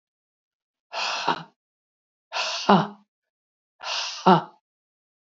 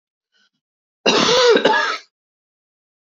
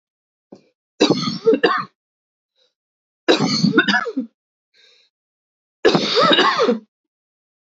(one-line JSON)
{"exhalation_length": "5.4 s", "exhalation_amplitude": 28924, "exhalation_signal_mean_std_ratio": 0.32, "cough_length": "3.2 s", "cough_amplitude": 27105, "cough_signal_mean_std_ratio": 0.44, "three_cough_length": "7.7 s", "three_cough_amplitude": 32106, "three_cough_signal_mean_std_ratio": 0.45, "survey_phase": "beta (2021-08-13 to 2022-03-07)", "age": "65+", "gender": "Female", "wearing_mask": "No", "symptom_cough_any": true, "symptom_runny_or_blocked_nose": true, "symptom_shortness_of_breath": true, "symptom_sore_throat": true, "symptom_fatigue": true, "symptom_headache": true, "symptom_change_to_sense_of_smell_or_taste": true, "symptom_other": true, "symptom_onset": "2 days", "smoker_status": "Never smoked", "respiratory_condition_asthma": false, "respiratory_condition_other": false, "recruitment_source": "Test and Trace", "submission_delay": "1 day", "covid_test_result": "Positive", "covid_test_method": "RT-qPCR", "covid_ct_value": 15.5, "covid_ct_gene": "ORF1ab gene"}